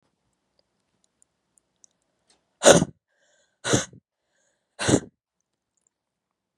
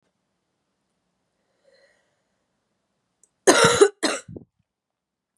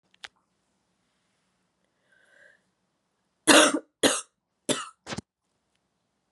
exhalation_length: 6.6 s
exhalation_amplitude: 32767
exhalation_signal_mean_std_ratio: 0.2
cough_length: 5.4 s
cough_amplitude: 32672
cough_signal_mean_std_ratio: 0.23
three_cough_length: 6.3 s
three_cough_amplitude: 26643
three_cough_signal_mean_std_ratio: 0.22
survey_phase: beta (2021-08-13 to 2022-03-07)
age: 18-44
gender: Female
wearing_mask: 'No'
symptom_runny_or_blocked_nose: true
symptom_fatigue: true
symptom_headache: true
symptom_change_to_sense_of_smell_or_taste: true
symptom_onset: 3 days
smoker_status: Current smoker (e-cigarettes or vapes only)
respiratory_condition_asthma: true
respiratory_condition_other: false
recruitment_source: Test and Trace
submission_delay: 1 day
covid_test_result: Positive
covid_test_method: RT-qPCR
covid_ct_value: 24.5
covid_ct_gene: ORF1ab gene
covid_ct_mean: 25.1
covid_viral_load: 5700 copies/ml
covid_viral_load_category: Minimal viral load (< 10K copies/ml)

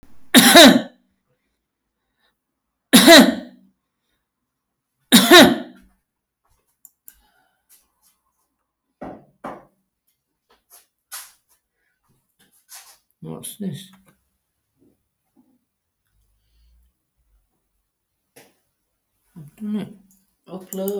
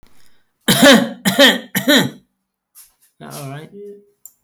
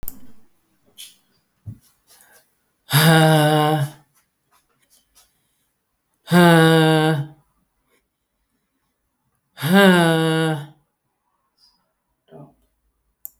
three_cough_length: 21.0 s
three_cough_amplitude: 32768
three_cough_signal_mean_std_ratio: 0.23
cough_length: 4.4 s
cough_amplitude: 32768
cough_signal_mean_std_ratio: 0.41
exhalation_length: 13.4 s
exhalation_amplitude: 31438
exhalation_signal_mean_std_ratio: 0.38
survey_phase: alpha (2021-03-01 to 2021-08-12)
age: 65+
gender: Male
wearing_mask: 'No'
symptom_fatigue: true
smoker_status: Never smoked
respiratory_condition_asthma: false
respiratory_condition_other: false
recruitment_source: REACT
submission_delay: 2 days
covid_test_result: Negative
covid_test_method: RT-qPCR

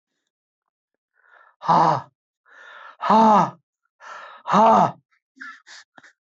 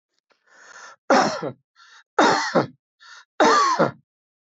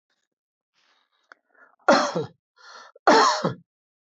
exhalation_length: 6.2 s
exhalation_amplitude: 18512
exhalation_signal_mean_std_ratio: 0.38
three_cough_length: 4.5 s
three_cough_amplitude: 20323
three_cough_signal_mean_std_ratio: 0.44
cough_length: 4.1 s
cough_amplitude: 19311
cough_signal_mean_std_ratio: 0.33
survey_phase: beta (2021-08-13 to 2022-03-07)
age: 65+
gender: Male
wearing_mask: 'No'
symptom_none: true
smoker_status: Ex-smoker
respiratory_condition_asthma: false
respiratory_condition_other: false
recruitment_source: REACT
submission_delay: 0 days
covid_test_result: Negative
covid_test_method: RT-qPCR
influenza_a_test_result: Unknown/Void
influenza_b_test_result: Unknown/Void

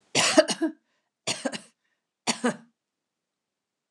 three_cough_length: 3.9 s
three_cough_amplitude: 20459
three_cough_signal_mean_std_ratio: 0.32
survey_phase: beta (2021-08-13 to 2022-03-07)
age: 65+
gender: Female
wearing_mask: 'No'
symptom_none: true
smoker_status: Never smoked
respiratory_condition_asthma: false
respiratory_condition_other: false
recruitment_source: REACT
submission_delay: 1 day
covid_test_result: Negative
covid_test_method: RT-qPCR
influenza_a_test_result: Negative
influenza_b_test_result: Negative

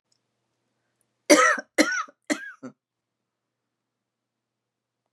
three_cough_length: 5.1 s
three_cough_amplitude: 29852
three_cough_signal_mean_std_ratio: 0.25
survey_phase: beta (2021-08-13 to 2022-03-07)
age: 45-64
gender: Female
wearing_mask: 'No'
symptom_cough_any: true
symptom_sore_throat: true
smoker_status: Never smoked
respiratory_condition_asthma: false
respiratory_condition_other: false
recruitment_source: Test and Trace
submission_delay: 1 day
covid_test_result: Negative
covid_test_method: LFT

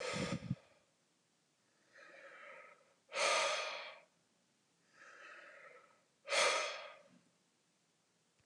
exhalation_length: 8.5 s
exhalation_amplitude: 3147
exhalation_signal_mean_std_ratio: 0.4
survey_phase: beta (2021-08-13 to 2022-03-07)
age: 45-64
gender: Male
wearing_mask: 'No'
symptom_none: true
symptom_onset: 12 days
smoker_status: Never smoked
respiratory_condition_asthma: true
respiratory_condition_other: false
recruitment_source: REACT
submission_delay: 1 day
covid_test_result: Negative
covid_test_method: RT-qPCR
influenza_a_test_result: Negative
influenza_b_test_result: Negative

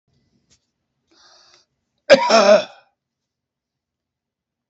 cough_length: 4.7 s
cough_amplitude: 29668
cough_signal_mean_std_ratio: 0.26
survey_phase: alpha (2021-03-01 to 2021-08-12)
age: 65+
gender: Male
wearing_mask: 'No'
symptom_none: true
smoker_status: Current smoker (11 or more cigarettes per day)
respiratory_condition_asthma: false
respiratory_condition_other: false
recruitment_source: REACT
submission_delay: 3 days
covid_test_method: RT-qPCR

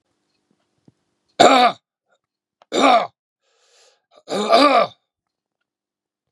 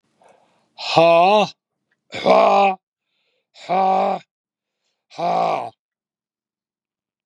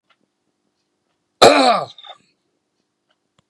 three_cough_length: 6.3 s
three_cough_amplitude: 32768
three_cough_signal_mean_std_ratio: 0.34
exhalation_length: 7.3 s
exhalation_amplitude: 32698
exhalation_signal_mean_std_ratio: 0.45
cough_length: 3.5 s
cough_amplitude: 32768
cough_signal_mean_std_ratio: 0.26
survey_phase: beta (2021-08-13 to 2022-03-07)
age: 65+
gender: Male
wearing_mask: 'No'
symptom_none: true
smoker_status: Ex-smoker
respiratory_condition_asthma: false
respiratory_condition_other: false
recruitment_source: REACT
submission_delay: 2 days
covid_test_result: Negative
covid_test_method: RT-qPCR
influenza_a_test_result: Negative
influenza_b_test_result: Negative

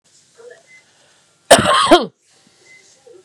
cough_length: 3.2 s
cough_amplitude: 32768
cough_signal_mean_std_ratio: 0.31
survey_phase: beta (2021-08-13 to 2022-03-07)
age: 45-64
gender: Female
wearing_mask: 'No'
symptom_sore_throat: true
symptom_headache: true
smoker_status: Ex-smoker
respiratory_condition_asthma: false
respiratory_condition_other: false
recruitment_source: REACT
submission_delay: 2 days
covid_test_result: Negative
covid_test_method: RT-qPCR
influenza_a_test_result: Negative
influenza_b_test_result: Negative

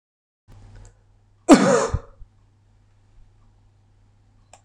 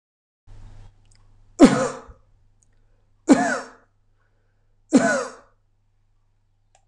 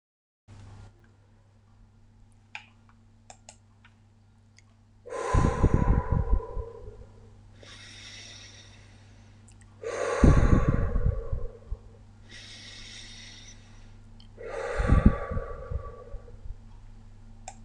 cough_length: 4.6 s
cough_amplitude: 26028
cough_signal_mean_std_ratio: 0.24
three_cough_length: 6.9 s
three_cough_amplitude: 26028
three_cough_signal_mean_std_ratio: 0.27
exhalation_length: 17.6 s
exhalation_amplitude: 18954
exhalation_signal_mean_std_ratio: 0.4
survey_phase: beta (2021-08-13 to 2022-03-07)
age: 45-64
gender: Male
wearing_mask: 'No'
symptom_none: true
smoker_status: Never smoked
respiratory_condition_asthma: false
respiratory_condition_other: false
recruitment_source: REACT
submission_delay: 2 days
covid_test_result: Negative
covid_test_method: RT-qPCR
influenza_a_test_result: Negative
influenza_b_test_result: Negative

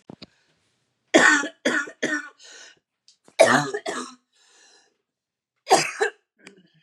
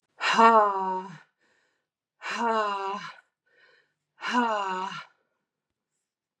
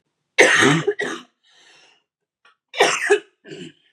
three_cough_length: 6.8 s
three_cough_amplitude: 31088
three_cough_signal_mean_std_ratio: 0.34
exhalation_length: 6.4 s
exhalation_amplitude: 16698
exhalation_signal_mean_std_ratio: 0.43
cough_length: 3.9 s
cough_amplitude: 32768
cough_signal_mean_std_ratio: 0.41
survey_phase: beta (2021-08-13 to 2022-03-07)
age: 45-64
gender: Female
wearing_mask: 'No'
symptom_cough_any: true
symptom_runny_or_blocked_nose: true
symptom_onset: 3 days
smoker_status: Never smoked
respiratory_condition_asthma: false
respiratory_condition_other: false
recruitment_source: Test and Trace
submission_delay: 2 days
covid_test_result: Positive
covid_test_method: RT-qPCR
covid_ct_value: 25.1
covid_ct_gene: ORF1ab gene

